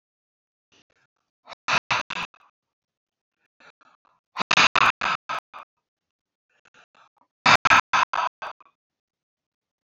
{"exhalation_length": "9.8 s", "exhalation_amplitude": 23968, "exhalation_signal_mean_std_ratio": 0.27, "survey_phase": "alpha (2021-03-01 to 2021-08-12)", "age": "65+", "gender": "Male", "wearing_mask": "No", "symptom_none": true, "smoker_status": "Ex-smoker", "respiratory_condition_asthma": false, "respiratory_condition_other": false, "recruitment_source": "REACT", "submission_delay": "1 day", "covid_test_result": "Negative", "covid_test_method": "RT-qPCR"}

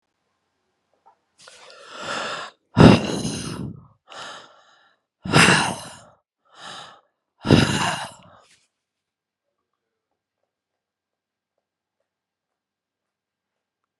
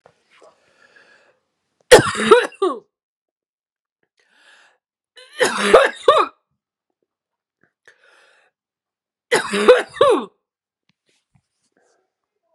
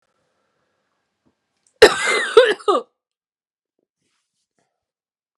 {"exhalation_length": "14.0 s", "exhalation_amplitude": 32768, "exhalation_signal_mean_std_ratio": 0.26, "three_cough_length": "12.5 s", "three_cough_amplitude": 32768, "three_cough_signal_mean_std_ratio": 0.28, "cough_length": "5.4 s", "cough_amplitude": 32768, "cough_signal_mean_std_ratio": 0.25, "survey_phase": "alpha (2021-03-01 to 2021-08-12)", "age": "45-64", "gender": "Female", "wearing_mask": "Yes", "symptom_cough_any": true, "symptom_shortness_of_breath": true, "symptom_fever_high_temperature": true, "symptom_change_to_sense_of_smell_or_taste": true, "symptom_onset": "4 days", "smoker_status": "Current smoker (1 to 10 cigarettes per day)", "respiratory_condition_asthma": false, "respiratory_condition_other": false, "recruitment_source": "Test and Trace", "submission_delay": "2 days", "covid_test_result": "Positive", "covid_test_method": "RT-qPCR"}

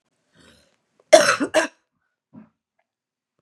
{"cough_length": "3.4 s", "cough_amplitude": 32768, "cough_signal_mean_std_ratio": 0.24, "survey_phase": "beta (2021-08-13 to 2022-03-07)", "age": "18-44", "gender": "Female", "wearing_mask": "No", "symptom_runny_or_blocked_nose": true, "symptom_sore_throat": true, "symptom_diarrhoea": true, "symptom_fatigue": true, "symptom_fever_high_temperature": true, "symptom_headache": true, "symptom_other": true, "symptom_onset": "3 days", "smoker_status": "Ex-smoker", "respiratory_condition_asthma": false, "respiratory_condition_other": false, "recruitment_source": "Test and Trace", "submission_delay": "2 days", "covid_test_result": "Positive", "covid_test_method": "RT-qPCR", "covid_ct_value": 22.5, "covid_ct_gene": "ORF1ab gene"}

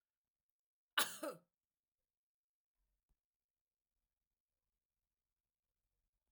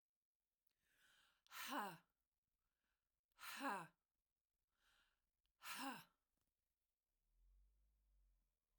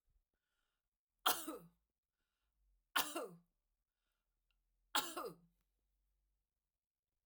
{"cough_length": "6.3 s", "cough_amplitude": 3383, "cough_signal_mean_std_ratio": 0.14, "exhalation_length": "8.8 s", "exhalation_amplitude": 569, "exhalation_signal_mean_std_ratio": 0.32, "three_cough_length": "7.3 s", "three_cough_amplitude": 3047, "three_cough_signal_mean_std_ratio": 0.24, "survey_phase": "alpha (2021-03-01 to 2021-08-12)", "age": "45-64", "gender": "Female", "wearing_mask": "No", "symptom_none": true, "smoker_status": "Never smoked", "respiratory_condition_asthma": false, "respiratory_condition_other": false, "recruitment_source": "REACT", "submission_delay": "2 days", "covid_test_result": "Negative", "covid_test_method": "RT-qPCR"}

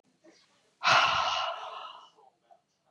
{"exhalation_length": "2.9 s", "exhalation_amplitude": 10735, "exhalation_signal_mean_std_ratio": 0.43, "survey_phase": "beta (2021-08-13 to 2022-03-07)", "age": "45-64", "gender": "Female", "wearing_mask": "No", "symptom_runny_or_blocked_nose": true, "symptom_diarrhoea": true, "symptom_onset": "8 days", "smoker_status": "Never smoked", "respiratory_condition_asthma": false, "respiratory_condition_other": false, "recruitment_source": "Test and Trace", "submission_delay": "1 day", "covid_test_result": "Positive", "covid_test_method": "RT-qPCR", "covid_ct_value": 27.9, "covid_ct_gene": "ORF1ab gene"}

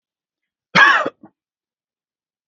{"cough_length": "2.5 s", "cough_amplitude": 32768, "cough_signal_mean_std_ratio": 0.28, "survey_phase": "beta (2021-08-13 to 2022-03-07)", "age": "18-44", "gender": "Male", "wearing_mask": "No", "symptom_none": true, "symptom_onset": "10 days", "smoker_status": "Never smoked", "respiratory_condition_asthma": true, "respiratory_condition_other": false, "recruitment_source": "REACT", "submission_delay": "2 days", "covid_test_result": "Negative", "covid_test_method": "RT-qPCR", "influenza_a_test_result": "Negative", "influenza_b_test_result": "Negative"}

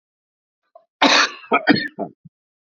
{"cough_length": "2.7 s", "cough_amplitude": 28211, "cough_signal_mean_std_ratio": 0.37, "survey_phase": "beta (2021-08-13 to 2022-03-07)", "age": "45-64", "gender": "Male", "wearing_mask": "No", "symptom_cough_any": true, "symptom_new_continuous_cough": true, "symptom_runny_or_blocked_nose": true, "symptom_sore_throat": true, "symptom_abdominal_pain": true, "symptom_fever_high_temperature": true, "symptom_headache": true, "smoker_status": "Ex-smoker", "respiratory_condition_asthma": false, "respiratory_condition_other": false, "recruitment_source": "Test and Trace", "submission_delay": "0 days", "covid_test_result": "Positive", "covid_test_method": "LFT"}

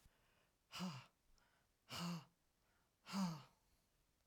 {"exhalation_length": "4.3 s", "exhalation_amplitude": 763, "exhalation_signal_mean_std_ratio": 0.41, "survey_phase": "alpha (2021-03-01 to 2021-08-12)", "age": "45-64", "gender": "Female", "wearing_mask": "No", "symptom_none": true, "smoker_status": "Ex-smoker", "respiratory_condition_asthma": false, "respiratory_condition_other": false, "recruitment_source": "REACT", "submission_delay": "2 days", "covid_test_result": "Negative", "covid_test_method": "RT-qPCR"}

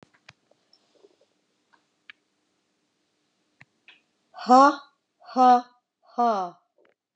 {"exhalation_length": "7.2 s", "exhalation_amplitude": 22273, "exhalation_signal_mean_std_ratio": 0.26, "survey_phase": "beta (2021-08-13 to 2022-03-07)", "age": "45-64", "gender": "Female", "wearing_mask": "No", "symptom_none": true, "smoker_status": "Ex-smoker", "respiratory_condition_asthma": false, "respiratory_condition_other": false, "recruitment_source": "REACT", "submission_delay": "1 day", "covid_test_result": "Negative", "covid_test_method": "RT-qPCR", "influenza_a_test_result": "Negative", "influenza_b_test_result": "Negative"}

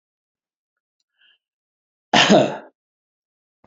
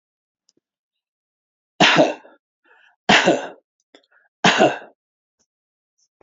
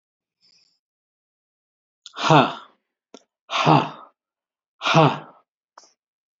{"cough_length": "3.7 s", "cough_amplitude": 31080, "cough_signal_mean_std_ratio": 0.25, "three_cough_length": "6.2 s", "three_cough_amplitude": 29202, "three_cough_signal_mean_std_ratio": 0.3, "exhalation_length": "6.4 s", "exhalation_amplitude": 27869, "exhalation_signal_mean_std_ratio": 0.29, "survey_phase": "beta (2021-08-13 to 2022-03-07)", "age": "65+", "gender": "Male", "wearing_mask": "No", "symptom_none": true, "smoker_status": "Ex-smoker", "respiratory_condition_asthma": false, "respiratory_condition_other": false, "recruitment_source": "REACT", "submission_delay": "2 days", "covid_test_result": "Negative", "covid_test_method": "RT-qPCR"}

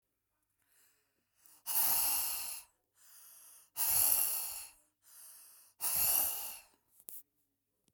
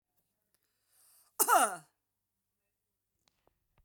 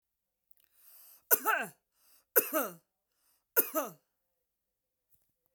{"exhalation_length": "7.9 s", "exhalation_amplitude": 8020, "exhalation_signal_mean_std_ratio": 0.47, "cough_length": "3.8 s", "cough_amplitude": 7864, "cough_signal_mean_std_ratio": 0.22, "three_cough_length": "5.5 s", "three_cough_amplitude": 12999, "three_cough_signal_mean_std_ratio": 0.27, "survey_phase": "beta (2021-08-13 to 2022-03-07)", "age": "45-64", "gender": "Female", "wearing_mask": "Yes", "symptom_headache": true, "smoker_status": "Ex-smoker", "respiratory_condition_asthma": false, "respiratory_condition_other": false, "recruitment_source": "REACT", "submission_delay": "1 day", "covid_test_result": "Negative", "covid_test_method": "RT-qPCR"}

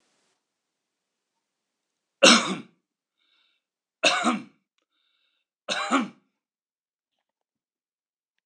{"three_cough_length": "8.5 s", "three_cough_amplitude": 26028, "three_cough_signal_mean_std_ratio": 0.23, "survey_phase": "alpha (2021-03-01 to 2021-08-12)", "age": "45-64", "gender": "Male", "wearing_mask": "No", "symptom_none": true, "smoker_status": "Ex-smoker", "respiratory_condition_asthma": false, "respiratory_condition_other": false, "recruitment_source": "REACT", "submission_delay": "2 days", "covid_test_result": "Negative", "covid_test_method": "RT-qPCR"}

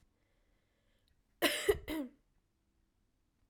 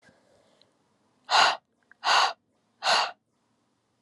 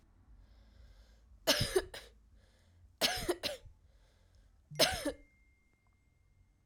{"cough_length": "3.5 s", "cough_amplitude": 5135, "cough_signal_mean_std_ratio": 0.28, "exhalation_length": "4.0 s", "exhalation_amplitude": 16388, "exhalation_signal_mean_std_ratio": 0.36, "three_cough_length": "6.7 s", "three_cough_amplitude": 7750, "three_cough_signal_mean_std_ratio": 0.34, "survey_phase": "alpha (2021-03-01 to 2021-08-12)", "age": "18-44", "gender": "Female", "wearing_mask": "No", "symptom_fatigue": true, "symptom_change_to_sense_of_smell_or_taste": true, "symptom_loss_of_taste": true, "symptom_onset": "4 days", "smoker_status": "Ex-smoker", "respiratory_condition_asthma": false, "respiratory_condition_other": false, "recruitment_source": "Test and Trace", "submission_delay": "1 day", "covid_test_result": "Positive", "covid_test_method": "RT-qPCR", "covid_ct_value": 15.0, "covid_ct_gene": "ORF1ab gene", "covid_ct_mean": 16.4, "covid_viral_load": "4100000 copies/ml", "covid_viral_load_category": "High viral load (>1M copies/ml)"}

